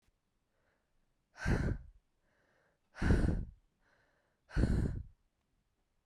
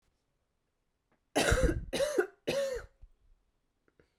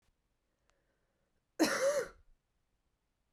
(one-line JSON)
{"exhalation_length": "6.1 s", "exhalation_amplitude": 4412, "exhalation_signal_mean_std_ratio": 0.37, "three_cough_length": "4.2 s", "three_cough_amplitude": 7218, "three_cough_signal_mean_std_ratio": 0.42, "cough_length": "3.3 s", "cough_amplitude": 5081, "cough_signal_mean_std_ratio": 0.31, "survey_phase": "beta (2021-08-13 to 2022-03-07)", "age": "18-44", "gender": "Female", "wearing_mask": "No", "symptom_cough_any": true, "symptom_runny_or_blocked_nose": true, "symptom_sore_throat": true, "symptom_headache": true, "symptom_onset": "3 days", "smoker_status": "Never smoked", "respiratory_condition_asthma": false, "respiratory_condition_other": false, "recruitment_source": "Test and Trace", "submission_delay": "2 days", "covid_test_result": "Positive", "covid_test_method": "RT-qPCR", "covid_ct_value": 15.7, "covid_ct_gene": "N gene", "covid_ct_mean": 17.0, "covid_viral_load": "2700000 copies/ml", "covid_viral_load_category": "High viral load (>1M copies/ml)"}